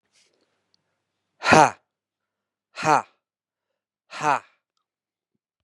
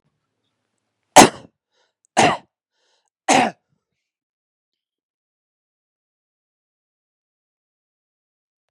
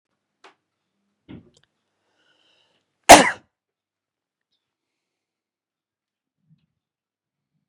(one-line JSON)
{"exhalation_length": "5.6 s", "exhalation_amplitude": 32701, "exhalation_signal_mean_std_ratio": 0.21, "three_cough_length": "8.7 s", "three_cough_amplitude": 32768, "three_cough_signal_mean_std_ratio": 0.17, "cough_length": "7.7 s", "cough_amplitude": 32768, "cough_signal_mean_std_ratio": 0.12, "survey_phase": "beta (2021-08-13 to 2022-03-07)", "age": "45-64", "gender": "Male", "wearing_mask": "No", "symptom_runny_or_blocked_nose": true, "symptom_sore_throat": true, "symptom_other": true, "symptom_onset": "0 days", "smoker_status": "Prefer not to say", "respiratory_condition_asthma": false, "respiratory_condition_other": false, "recruitment_source": "Test and Trace", "submission_delay": "0 days", "covid_test_result": "Positive", "covid_test_method": "RT-qPCR", "covid_ct_value": 23.9, "covid_ct_gene": "ORF1ab gene", "covid_ct_mean": 24.4, "covid_viral_load": "10000 copies/ml", "covid_viral_load_category": "Low viral load (10K-1M copies/ml)"}